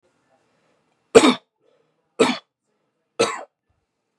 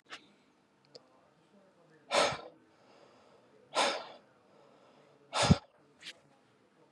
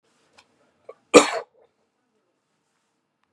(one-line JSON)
{"three_cough_length": "4.2 s", "three_cough_amplitude": 32768, "three_cough_signal_mean_std_ratio": 0.24, "exhalation_length": "6.9 s", "exhalation_amplitude": 10504, "exhalation_signal_mean_std_ratio": 0.27, "cough_length": "3.3 s", "cough_amplitude": 32768, "cough_signal_mean_std_ratio": 0.16, "survey_phase": "beta (2021-08-13 to 2022-03-07)", "age": "18-44", "gender": "Male", "wearing_mask": "No", "symptom_none": true, "smoker_status": "Never smoked", "respiratory_condition_asthma": false, "respiratory_condition_other": false, "recruitment_source": "REACT", "submission_delay": "1 day", "covid_test_result": "Negative", "covid_test_method": "RT-qPCR"}